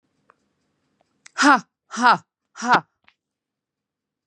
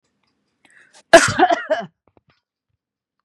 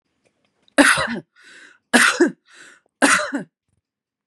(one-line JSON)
{"exhalation_length": "4.3 s", "exhalation_amplitude": 27908, "exhalation_signal_mean_std_ratio": 0.27, "cough_length": "3.2 s", "cough_amplitude": 32768, "cough_signal_mean_std_ratio": 0.27, "three_cough_length": "4.3 s", "three_cough_amplitude": 32767, "three_cough_signal_mean_std_ratio": 0.38, "survey_phase": "beta (2021-08-13 to 2022-03-07)", "age": "45-64", "gender": "Female", "wearing_mask": "No", "symptom_none": true, "smoker_status": "Never smoked", "respiratory_condition_asthma": false, "respiratory_condition_other": false, "recruitment_source": "REACT", "submission_delay": "0 days", "covid_test_result": "Negative", "covid_test_method": "RT-qPCR", "influenza_a_test_result": "Negative", "influenza_b_test_result": "Negative"}